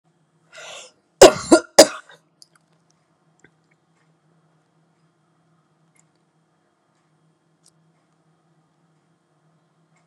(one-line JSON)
{"cough_length": "10.1 s", "cough_amplitude": 32768, "cough_signal_mean_std_ratio": 0.14, "survey_phase": "beta (2021-08-13 to 2022-03-07)", "age": "45-64", "gender": "Female", "wearing_mask": "No", "symptom_cough_any": true, "symptom_sore_throat": true, "symptom_fatigue": true, "symptom_fever_high_temperature": true, "symptom_headache": true, "symptom_onset": "7 days", "smoker_status": "Never smoked", "respiratory_condition_asthma": true, "respiratory_condition_other": false, "recruitment_source": "Test and Trace", "submission_delay": "2 days", "covid_test_result": "Positive", "covid_test_method": "RT-qPCR", "covid_ct_value": 22.6, "covid_ct_gene": "ORF1ab gene", "covid_ct_mean": 22.9, "covid_viral_load": "30000 copies/ml", "covid_viral_load_category": "Low viral load (10K-1M copies/ml)"}